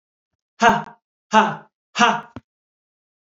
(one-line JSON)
{"exhalation_length": "3.3 s", "exhalation_amplitude": 31984, "exhalation_signal_mean_std_ratio": 0.33, "survey_phase": "beta (2021-08-13 to 2022-03-07)", "age": "18-44", "gender": "Male", "wearing_mask": "No", "symptom_none": true, "smoker_status": "Never smoked", "respiratory_condition_asthma": false, "respiratory_condition_other": false, "recruitment_source": "REACT", "submission_delay": "2 days", "covid_test_result": "Negative", "covid_test_method": "RT-qPCR", "influenza_a_test_result": "Negative", "influenza_b_test_result": "Negative"}